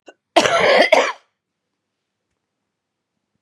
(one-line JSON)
{"cough_length": "3.4 s", "cough_amplitude": 32767, "cough_signal_mean_std_ratio": 0.36, "survey_phase": "beta (2021-08-13 to 2022-03-07)", "age": "45-64", "gender": "Female", "wearing_mask": "No", "symptom_cough_any": true, "symptom_new_continuous_cough": true, "symptom_runny_or_blocked_nose": true, "symptom_shortness_of_breath": true, "symptom_sore_throat": true, "symptom_fatigue": true, "symptom_change_to_sense_of_smell_or_taste": true, "symptom_loss_of_taste": true, "symptom_other": true, "symptom_onset": "6 days", "smoker_status": "Never smoked", "respiratory_condition_asthma": false, "respiratory_condition_other": false, "recruitment_source": "Test and Trace", "submission_delay": "1 day", "covid_test_result": "Negative", "covid_test_method": "ePCR"}